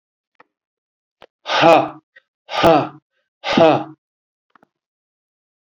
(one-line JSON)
{"exhalation_length": "5.6 s", "exhalation_amplitude": 32768, "exhalation_signal_mean_std_ratio": 0.33, "survey_phase": "beta (2021-08-13 to 2022-03-07)", "age": "65+", "gender": "Male", "wearing_mask": "No", "symptom_none": true, "smoker_status": "Ex-smoker", "respiratory_condition_asthma": false, "respiratory_condition_other": false, "recruitment_source": "REACT", "submission_delay": "3 days", "covid_test_result": "Negative", "covid_test_method": "RT-qPCR", "influenza_a_test_result": "Negative", "influenza_b_test_result": "Negative"}